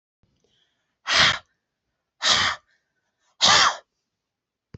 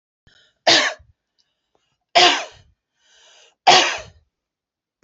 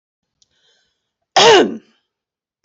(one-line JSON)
{"exhalation_length": "4.8 s", "exhalation_amplitude": 21808, "exhalation_signal_mean_std_ratio": 0.35, "three_cough_length": "5.0 s", "three_cough_amplitude": 30271, "three_cough_signal_mean_std_ratio": 0.31, "cough_length": "2.6 s", "cough_amplitude": 30633, "cough_signal_mean_std_ratio": 0.31, "survey_phase": "beta (2021-08-13 to 2022-03-07)", "age": "45-64", "gender": "Female", "wearing_mask": "No", "symptom_none": true, "smoker_status": "Never smoked", "respiratory_condition_asthma": false, "respiratory_condition_other": false, "recruitment_source": "REACT", "submission_delay": "1 day", "covid_test_result": "Negative", "covid_test_method": "RT-qPCR"}